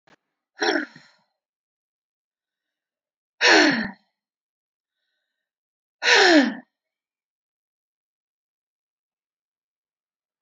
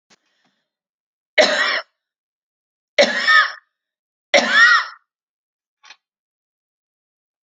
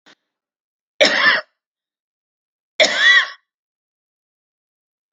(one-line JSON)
{"exhalation_length": "10.4 s", "exhalation_amplitude": 24970, "exhalation_signal_mean_std_ratio": 0.26, "three_cough_length": "7.4 s", "three_cough_amplitude": 30429, "three_cough_signal_mean_std_ratio": 0.33, "cough_length": "5.1 s", "cough_amplitude": 32768, "cough_signal_mean_std_ratio": 0.32, "survey_phase": "alpha (2021-03-01 to 2021-08-12)", "age": "65+", "gender": "Female", "wearing_mask": "No", "symptom_none": true, "smoker_status": "Ex-smoker", "respiratory_condition_asthma": false, "respiratory_condition_other": false, "recruitment_source": "REACT", "submission_delay": "4 days", "covid_test_result": "Negative", "covid_test_method": "RT-qPCR"}